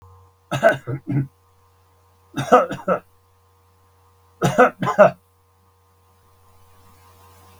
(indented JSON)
{
  "three_cough_length": "7.6 s",
  "three_cough_amplitude": 32768,
  "three_cough_signal_mean_std_ratio": 0.31,
  "survey_phase": "beta (2021-08-13 to 2022-03-07)",
  "age": "65+",
  "gender": "Male",
  "wearing_mask": "No",
  "symptom_none": true,
  "smoker_status": "Never smoked",
  "respiratory_condition_asthma": false,
  "respiratory_condition_other": false,
  "recruitment_source": "REACT",
  "submission_delay": "0 days",
  "covid_test_result": "Negative",
  "covid_test_method": "RT-qPCR",
  "influenza_a_test_result": "Negative",
  "influenza_b_test_result": "Negative"
}